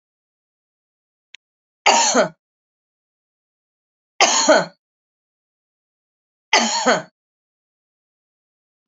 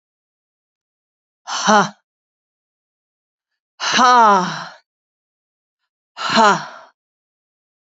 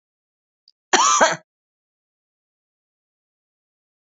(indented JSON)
{
  "three_cough_length": "8.9 s",
  "three_cough_amplitude": 30866,
  "three_cough_signal_mean_std_ratio": 0.29,
  "exhalation_length": "7.9 s",
  "exhalation_amplitude": 30156,
  "exhalation_signal_mean_std_ratio": 0.33,
  "cough_length": "4.0 s",
  "cough_amplitude": 29523,
  "cough_signal_mean_std_ratio": 0.25,
  "survey_phase": "alpha (2021-03-01 to 2021-08-12)",
  "age": "65+",
  "gender": "Female",
  "wearing_mask": "No",
  "symptom_none": true,
  "smoker_status": "Ex-smoker",
  "respiratory_condition_asthma": false,
  "respiratory_condition_other": false,
  "recruitment_source": "REACT",
  "submission_delay": "2 days",
  "covid_test_result": "Negative",
  "covid_test_method": "RT-qPCR"
}